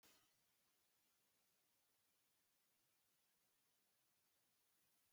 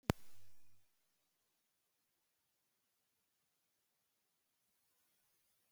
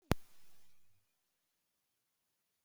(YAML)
three_cough_length: 5.1 s
three_cough_amplitude: 40
three_cough_signal_mean_std_ratio: 0.89
exhalation_length: 5.7 s
exhalation_amplitude: 5948
exhalation_signal_mean_std_ratio: 0.21
cough_length: 2.6 s
cough_amplitude: 7383
cough_signal_mean_std_ratio: 0.24
survey_phase: beta (2021-08-13 to 2022-03-07)
age: 65+
gender: Female
wearing_mask: 'No'
symptom_none: true
smoker_status: Never smoked
respiratory_condition_asthma: false
respiratory_condition_other: false
recruitment_source: REACT
submission_delay: 2 days
covid_test_result: Negative
covid_test_method: RT-qPCR
influenza_a_test_result: Negative
influenza_b_test_result: Negative